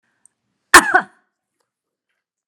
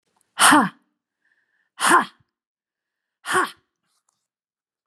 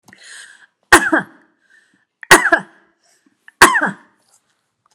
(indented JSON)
{
  "cough_length": "2.5 s",
  "cough_amplitude": 32768,
  "cough_signal_mean_std_ratio": 0.21,
  "exhalation_length": "4.9 s",
  "exhalation_amplitude": 29672,
  "exhalation_signal_mean_std_ratio": 0.3,
  "three_cough_length": "4.9 s",
  "three_cough_amplitude": 32768,
  "three_cough_signal_mean_std_ratio": 0.29,
  "survey_phase": "beta (2021-08-13 to 2022-03-07)",
  "age": "45-64",
  "gender": "Female",
  "wearing_mask": "No",
  "symptom_none": true,
  "smoker_status": "Ex-smoker",
  "respiratory_condition_asthma": false,
  "respiratory_condition_other": false,
  "recruitment_source": "REACT",
  "submission_delay": "2 days",
  "covid_test_result": "Negative",
  "covid_test_method": "RT-qPCR"
}